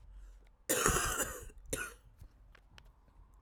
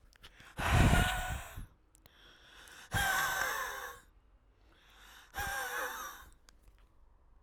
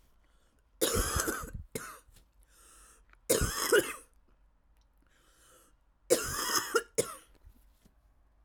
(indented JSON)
{
  "cough_length": "3.4 s",
  "cough_amplitude": 8740,
  "cough_signal_mean_std_ratio": 0.46,
  "exhalation_length": "7.4 s",
  "exhalation_amplitude": 6317,
  "exhalation_signal_mean_std_ratio": 0.47,
  "three_cough_length": "8.4 s",
  "three_cough_amplitude": 9075,
  "three_cough_signal_mean_std_ratio": 0.39,
  "survey_phase": "alpha (2021-03-01 to 2021-08-12)",
  "age": "18-44",
  "gender": "Female",
  "wearing_mask": "No",
  "symptom_cough_any": true,
  "symptom_shortness_of_breath": true,
  "symptom_fatigue": true,
  "symptom_headache": true,
  "symptom_change_to_sense_of_smell_or_taste": true,
  "smoker_status": "Current smoker (1 to 10 cigarettes per day)",
  "respiratory_condition_asthma": false,
  "respiratory_condition_other": false,
  "recruitment_source": "Test and Trace",
  "submission_delay": "1 day",
  "covid_test_result": "Positive",
  "covid_test_method": "RT-qPCR",
  "covid_ct_value": 17.2,
  "covid_ct_gene": "ORF1ab gene",
  "covid_ct_mean": 19.0,
  "covid_viral_load": "600000 copies/ml",
  "covid_viral_load_category": "Low viral load (10K-1M copies/ml)"
}